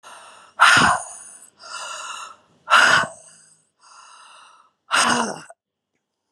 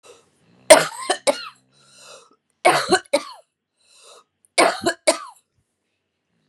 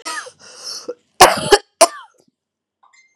{"exhalation_length": "6.3 s", "exhalation_amplitude": 29076, "exhalation_signal_mean_std_ratio": 0.39, "three_cough_length": "6.5 s", "three_cough_amplitude": 32768, "three_cough_signal_mean_std_ratio": 0.29, "cough_length": "3.2 s", "cough_amplitude": 32768, "cough_signal_mean_std_ratio": 0.29, "survey_phase": "beta (2021-08-13 to 2022-03-07)", "age": "45-64", "gender": "Female", "wearing_mask": "No", "symptom_cough_any": true, "symptom_runny_or_blocked_nose": true, "symptom_sore_throat": true, "symptom_fatigue": true, "symptom_onset": "4 days", "smoker_status": "Ex-smoker", "respiratory_condition_asthma": false, "respiratory_condition_other": false, "recruitment_source": "REACT", "submission_delay": "1 day", "covid_test_result": "Positive", "covid_test_method": "RT-qPCR", "covid_ct_value": 23.0, "covid_ct_gene": "E gene", "influenza_a_test_result": "Negative", "influenza_b_test_result": "Negative"}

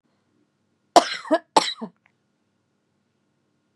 {"cough_length": "3.8 s", "cough_amplitude": 32767, "cough_signal_mean_std_ratio": 0.21, "survey_phase": "beta (2021-08-13 to 2022-03-07)", "age": "18-44", "gender": "Female", "wearing_mask": "No", "symptom_runny_or_blocked_nose": true, "symptom_onset": "4 days", "smoker_status": "Ex-smoker", "respiratory_condition_asthma": false, "respiratory_condition_other": false, "recruitment_source": "Test and Trace", "submission_delay": "2 days", "covid_test_result": "Positive", "covid_test_method": "RT-qPCR", "covid_ct_value": 20.3, "covid_ct_gene": "N gene"}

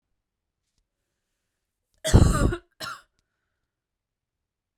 {"cough_length": "4.8 s", "cough_amplitude": 23121, "cough_signal_mean_std_ratio": 0.24, "survey_phase": "beta (2021-08-13 to 2022-03-07)", "age": "18-44", "gender": "Female", "wearing_mask": "No", "symptom_sore_throat": true, "smoker_status": "Current smoker (e-cigarettes or vapes only)", "respiratory_condition_asthma": false, "respiratory_condition_other": false, "recruitment_source": "REACT", "submission_delay": "1 day", "covid_test_result": "Positive", "covid_test_method": "RT-qPCR", "covid_ct_value": 36.0, "covid_ct_gene": "N gene", "influenza_a_test_result": "Negative", "influenza_b_test_result": "Negative"}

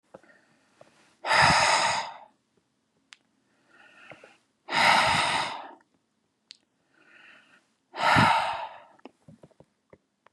{"exhalation_length": "10.3 s", "exhalation_amplitude": 17216, "exhalation_signal_mean_std_ratio": 0.39, "survey_phase": "beta (2021-08-13 to 2022-03-07)", "age": "65+", "gender": "Male", "wearing_mask": "No", "symptom_none": true, "smoker_status": "Never smoked", "respiratory_condition_asthma": false, "respiratory_condition_other": false, "recruitment_source": "REACT", "submission_delay": "2 days", "covid_test_result": "Negative", "covid_test_method": "RT-qPCR", "influenza_a_test_result": "Negative", "influenza_b_test_result": "Negative"}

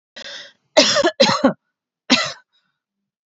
{"cough_length": "3.3 s", "cough_amplitude": 31873, "cough_signal_mean_std_ratio": 0.4, "survey_phase": "beta (2021-08-13 to 2022-03-07)", "age": "18-44", "gender": "Female", "wearing_mask": "No", "symptom_prefer_not_to_say": true, "smoker_status": "Current smoker (1 to 10 cigarettes per day)", "respiratory_condition_asthma": false, "respiratory_condition_other": false, "recruitment_source": "REACT", "submission_delay": "1 day", "covid_test_result": "Negative", "covid_test_method": "RT-qPCR", "influenza_a_test_result": "Negative", "influenza_b_test_result": "Negative"}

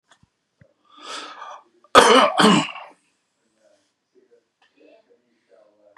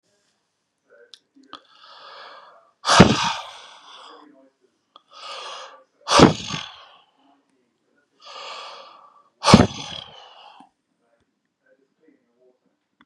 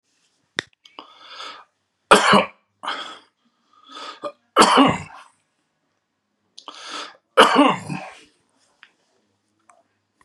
{"cough_length": "6.0 s", "cough_amplitude": 32768, "cough_signal_mean_std_ratio": 0.28, "exhalation_length": "13.1 s", "exhalation_amplitude": 32768, "exhalation_signal_mean_std_ratio": 0.23, "three_cough_length": "10.2 s", "three_cough_amplitude": 32767, "three_cough_signal_mean_std_ratio": 0.29, "survey_phase": "beta (2021-08-13 to 2022-03-07)", "age": "65+", "gender": "Male", "wearing_mask": "No", "symptom_none": true, "smoker_status": "Ex-smoker", "respiratory_condition_asthma": false, "respiratory_condition_other": false, "recruitment_source": "REACT", "submission_delay": "1 day", "covid_test_result": "Negative", "covid_test_method": "RT-qPCR"}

